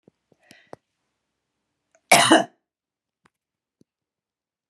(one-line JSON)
{"cough_length": "4.7 s", "cough_amplitude": 32768, "cough_signal_mean_std_ratio": 0.2, "survey_phase": "alpha (2021-03-01 to 2021-08-12)", "age": "65+", "gender": "Female", "wearing_mask": "No", "symptom_none": true, "smoker_status": "Ex-smoker", "respiratory_condition_asthma": false, "respiratory_condition_other": false, "recruitment_source": "REACT", "submission_delay": "3 days", "covid_test_result": "Negative", "covid_test_method": "RT-qPCR"}